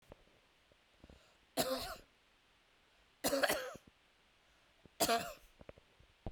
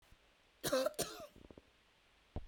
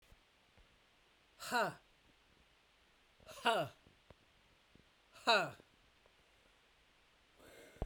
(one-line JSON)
{"three_cough_length": "6.3 s", "three_cough_amplitude": 4330, "three_cough_signal_mean_std_ratio": 0.35, "cough_length": "2.5 s", "cough_amplitude": 2408, "cough_signal_mean_std_ratio": 0.39, "exhalation_length": "7.9 s", "exhalation_amplitude": 3383, "exhalation_signal_mean_std_ratio": 0.28, "survey_phase": "beta (2021-08-13 to 2022-03-07)", "age": "45-64", "gender": "Female", "wearing_mask": "No", "symptom_none": true, "symptom_onset": "5 days", "smoker_status": "Ex-smoker", "respiratory_condition_asthma": false, "respiratory_condition_other": false, "recruitment_source": "Test and Trace", "submission_delay": "3 days", "covid_test_result": "Negative", "covid_test_method": "RT-qPCR"}